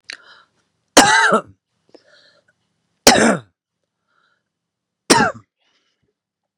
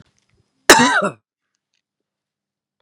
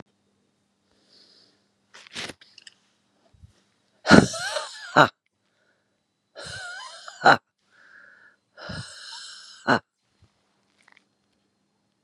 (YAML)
three_cough_length: 6.6 s
three_cough_amplitude: 32768
three_cough_signal_mean_std_ratio: 0.3
cough_length: 2.8 s
cough_amplitude: 32768
cough_signal_mean_std_ratio: 0.27
exhalation_length: 12.0 s
exhalation_amplitude: 32768
exhalation_signal_mean_std_ratio: 0.2
survey_phase: beta (2021-08-13 to 2022-03-07)
age: 45-64
gender: Female
wearing_mask: 'No'
symptom_none: true
symptom_onset: 6 days
smoker_status: Ex-smoker
respiratory_condition_asthma: false
respiratory_condition_other: false
recruitment_source: Test and Trace
submission_delay: 2 days
covid_test_result: Positive
covid_test_method: RT-qPCR
covid_ct_value: 18.7
covid_ct_gene: ORF1ab gene